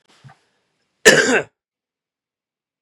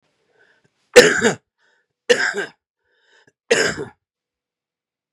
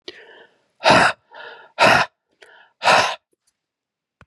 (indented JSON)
{
  "cough_length": "2.8 s",
  "cough_amplitude": 32768,
  "cough_signal_mean_std_ratio": 0.26,
  "three_cough_length": "5.1 s",
  "three_cough_amplitude": 32768,
  "three_cough_signal_mean_std_ratio": 0.29,
  "exhalation_length": "4.3 s",
  "exhalation_amplitude": 31186,
  "exhalation_signal_mean_std_ratio": 0.37,
  "survey_phase": "beta (2021-08-13 to 2022-03-07)",
  "age": "45-64",
  "gender": "Male",
  "wearing_mask": "No",
  "symptom_cough_any": true,
  "symptom_new_continuous_cough": true,
  "symptom_sore_throat": true,
  "symptom_fatigue": true,
  "symptom_fever_high_temperature": true,
  "smoker_status": "Ex-smoker",
  "respiratory_condition_asthma": false,
  "respiratory_condition_other": false,
  "recruitment_source": "Test and Trace",
  "submission_delay": "1 day",
  "covid_test_result": "Positive",
  "covid_test_method": "LFT"
}